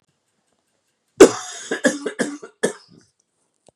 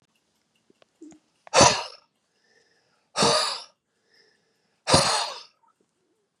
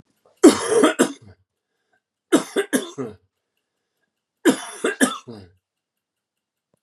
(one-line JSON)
{"cough_length": "3.8 s", "cough_amplitude": 32768, "cough_signal_mean_std_ratio": 0.24, "exhalation_length": "6.4 s", "exhalation_amplitude": 24837, "exhalation_signal_mean_std_ratio": 0.31, "three_cough_length": "6.8 s", "three_cough_amplitude": 32763, "three_cough_signal_mean_std_ratio": 0.31, "survey_phase": "beta (2021-08-13 to 2022-03-07)", "age": "45-64", "gender": "Male", "wearing_mask": "No", "symptom_cough_any": true, "symptom_runny_or_blocked_nose": true, "symptom_fatigue": true, "symptom_fever_high_temperature": true, "symptom_headache": true, "symptom_onset": "2 days", "smoker_status": "Ex-smoker", "respiratory_condition_asthma": false, "respiratory_condition_other": false, "recruitment_source": "Test and Trace", "submission_delay": "2 days", "covid_test_result": "Positive", "covid_test_method": "RT-qPCR", "covid_ct_value": 24.5, "covid_ct_gene": "ORF1ab gene"}